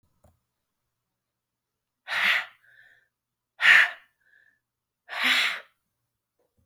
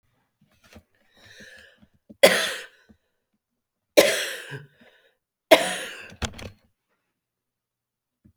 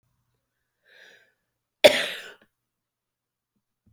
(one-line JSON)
{"exhalation_length": "6.7 s", "exhalation_amplitude": 21002, "exhalation_signal_mean_std_ratio": 0.29, "three_cough_length": "8.4 s", "three_cough_amplitude": 30555, "three_cough_signal_mean_std_ratio": 0.24, "cough_length": "3.9 s", "cough_amplitude": 27773, "cough_signal_mean_std_ratio": 0.16, "survey_phase": "alpha (2021-03-01 to 2021-08-12)", "age": "65+", "gender": "Female", "wearing_mask": "No", "symptom_none": true, "smoker_status": "Ex-smoker", "respiratory_condition_asthma": true, "respiratory_condition_other": false, "recruitment_source": "REACT", "submission_delay": "2 days", "covid_test_result": "Negative", "covid_test_method": "RT-qPCR"}